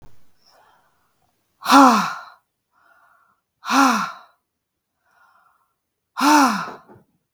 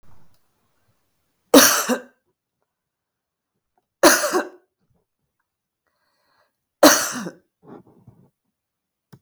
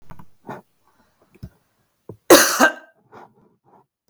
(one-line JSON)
{"exhalation_length": "7.3 s", "exhalation_amplitude": 32768, "exhalation_signal_mean_std_ratio": 0.33, "three_cough_length": "9.2 s", "three_cough_amplitude": 32768, "three_cough_signal_mean_std_ratio": 0.25, "cough_length": "4.1 s", "cough_amplitude": 32768, "cough_signal_mean_std_ratio": 0.25, "survey_phase": "beta (2021-08-13 to 2022-03-07)", "age": "45-64", "gender": "Female", "wearing_mask": "No", "symptom_none": true, "smoker_status": "Ex-smoker", "respiratory_condition_asthma": false, "respiratory_condition_other": false, "recruitment_source": "REACT", "submission_delay": "2 days", "covid_test_result": "Negative", "covid_test_method": "RT-qPCR", "influenza_a_test_result": "Negative", "influenza_b_test_result": "Negative"}